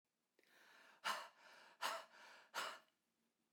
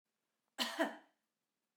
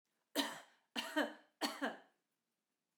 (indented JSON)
{
  "exhalation_length": "3.5 s",
  "exhalation_amplitude": 1610,
  "exhalation_signal_mean_std_ratio": 0.4,
  "cough_length": "1.8 s",
  "cough_amplitude": 3024,
  "cough_signal_mean_std_ratio": 0.31,
  "three_cough_length": "3.0 s",
  "three_cough_amplitude": 3092,
  "three_cough_signal_mean_std_ratio": 0.39,
  "survey_phase": "beta (2021-08-13 to 2022-03-07)",
  "age": "45-64",
  "gender": "Female",
  "wearing_mask": "No",
  "symptom_none": true,
  "smoker_status": "Ex-smoker",
  "respiratory_condition_asthma": false,
  "respiratory_condition_other": false,
  "recruitment_source": "REACT",
  "submission_delay": "2 days",
  "covid_test_result": "Negative",
  "covid_test_method": "RT-qPCR"
}